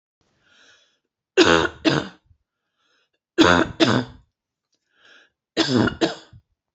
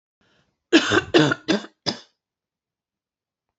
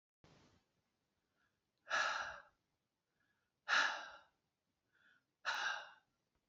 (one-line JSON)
{"three_cough_length": "6.7 s", "three_cough_amplitude": 28054, "three_cough_signal_mean_std_ratio": 0.35, "cough_length": "3.6 s", "cough_amplitude": 27206, "cough_signal_mean_std_ratio": 0.32, "exhalation_length": "6.5 s", "exhalation_amplitude": 2476, "exhalation_signal_mean_std_ratio": 0.33, "survey_phase": "alpha (2021-03-01 to 2021-08-12)", "age": "45-64", "gender": "Female", "wearing_mask": "No", "symptom_none": true, "symptom_onset": "13 days", "smoker_status": "Never smoked", "respiratory_condition_asthma": false, "respiratory_condition_other": false, "recruitment_source": "REACT", "submission_delay": "1 day", "covid_test_result": "Negative", "covid_test_method": "RT-qPCR"}